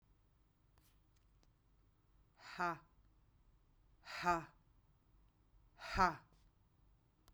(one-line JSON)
{"exhalation_length": "7.3 s", "exhalation_amplitude": 3913, "exhalation_signal_mean_std_ratio": 0.26, "survey_phase": "beta (2021-08-13 to 2022-03-07)", "age": "45-64", "gender": "Female", "wearing_mask": "No", "symptom_none": true, "smoker_status": "Never smoked", "respiratory_condition_asthma": false, "respiratory_condition_other": false, "recruitment_source": "REACT", "submission_delay": "1 day", "covid_test_result": "Negative", "covid_test_method": "RT-qPCR"}